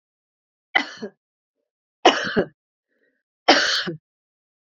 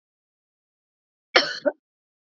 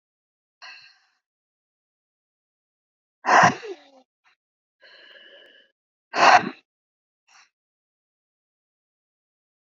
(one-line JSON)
{"three_cough_length": "4.8 s", "three_cough_amplitude": 30112, "three_cough_signal_mean_std_ratio": 0.3, "cough_length": "2.4 s", "cough_amplitude": 28126, "cough_signal_mean_std_ratio": 0.21, "exhalation_length": "9.6 s", "exhalation_amplitude": 27266, "exhalation_signal_mean_std_ratio": 0.2, "survey_phase": "beta (2021-08-13 to 2022-03-07)", "age": "45-64", "gender": "Female", "wearing_mask": "No", "symptom_cough_any": true, "symptom_runny_or_blocked_nose": true, "symptom_shortness_of_breath": true, "symptom_sore_throat": true, "symptom_fatigue": true, "symptom_fever_high_temperature": true, "symptom_headache": true, "symptom_change_to_sense_of_smell_or_taste": true, "symptom_loss_of_taste": true, "symptom_onset": "2 days", "smoker_status": "Never smoked", "respiratory_condition_asthma": false, "respiratory_condition_other": false, "recruitment_source": "Test and Trace", "submission_delay": "2 days", "covid_test_result": "Positive", "covid_test_method": "RT-qPCR"}